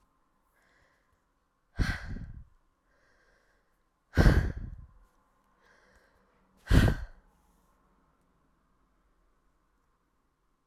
{"exhalation_length": "10.7 s", "exhalation_amplitude": 15382, "exhalation_signal_mean_std_ratio": 0.23, "survey_phase": "alpha (2021-03-01 to 2021-08-12)", "age": "18-44", "gender": "Female", "wearing_mask": "No", "symptom_cough_any": true, "symptom_shortness_of_breath": true, "symptom_fatigue": true, "symptom_change_to_sense_of_smell_or_taste": true, "symptom_loss_of_taste": true, "symptom_onset": "7 days", "smoker_status": "Never smoked", "respiratory_condition_asthma": false, "respiratory_condition_other": false, "recruitment_source": "Test and Trace", "submission_delay": "2 days", "covid_test_result": "Positive", "covid_test_method": "RT-qPCR", "covid_ct_value": 19.0, "covid_ct_gene": "ORF1ab gene", "covid_ct_mean": 19.4, "covid_viral_load": "440000 copies/ml", "covid_viral_load_category": "Low viral load (10K-1M copies/ml)"}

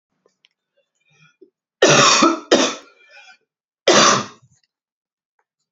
{"three_cough_length": "5.7 s", "three_cough_amplitude": 32768, "three_cough_signal_mean_std_ratio": 0.36, "survey_phase": "beta (2021-08-13 to 2022-03-07)", "age": "18-44", "gender": "Male", "wearing_mask": "No", "symptom_cough_any": true, "symptom_runny_or_blocked_nose": true, "symptom_change_to_sense_of_smell_or_taste": true, "symptom_loss_of_taste": true, "symptom_onset": "7 days", "smoker_status": "Never smoked", "respiratory_condition_asthma": false, "respiratory_condition_other": false, "recruitment_source": "REACT", "submission_delay": "0 days", "covid_test_result": "Positive", "covid_test_method": "RT-qPCR", "covid_ct_value": 29.0, "covid_ct_gene": "E gene"}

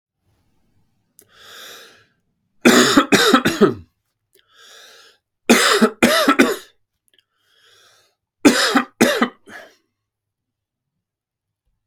{"three_cough_length": "11.9 s", "three_cough_amplitude": 32768, "three_cough_signal_mean_std_ratio": 0.36, "survey_phase": "beta (2021-08-13 to 2022-03-07)", "age": "18-44", "gender": "Male", "wearing_mask": "No", "symptom_runny_or_blocked_nose": true, "symptom_onset": "12 days", "smoker_status": "Never smoked", "respiratory_condition_asthma": false, "respiratory_condition_other": false, "recruitment_source": "REACT", "submission_delay": "2 days", "covid_test_result": "Negative", "covid_test_method": "RT-qPCR", "influenza_a_test_result": "Negative", "influenza_b_test_result": "Negative"}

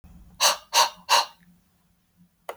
{"exhalation_length": "2.6 s", "exhalation_amplitude": 21202, "exhalation_signal_mean_std_ratio": 0.35, "survey_phase": "beta (2021-08-13 to 2022-03-07)", "age": "45-64", "gender": "Male", "wearing_mask": "No", "symptom_runny_or_blocked_nose": true, "symptom_fatigue": true, "symptom_fever_high_temperature": true, "symptom_onset": "3 days", "smoker_status": "Never smoked", "respiratory_condition_asthma": false, "respiratory_condition_other": false, "recruitment_source": "Test and Trace", "submission_delay": "2 days", "covid_test_result": "Positive", "covid_test_method": "RT-qPCR"}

